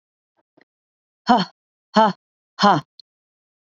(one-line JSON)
{"exhalation_length": "3.8 s", "exhalation_amplitude": 27981, "exhalation_signal_mean_std_ratio": 0.28, "survey_phase": "beta (2021-08-13 to 2022-03-07)", "age": "18-44", "gender": "Female", "wearing_mask": "No", "symptom_none": true, "smoker_status": "Ex-smoker", "respiratory_condition_asthma": false, "respiratory_condition_other": false, "recruitment_source": "REACT", "submission_delay": "-14 days", "covid_test_result": "Negative", "covid_test_method": "RT-qPCR", "influenza_a_test_result": "Unknown/Void", "influenza_b_test_result": "Unknown/Void"}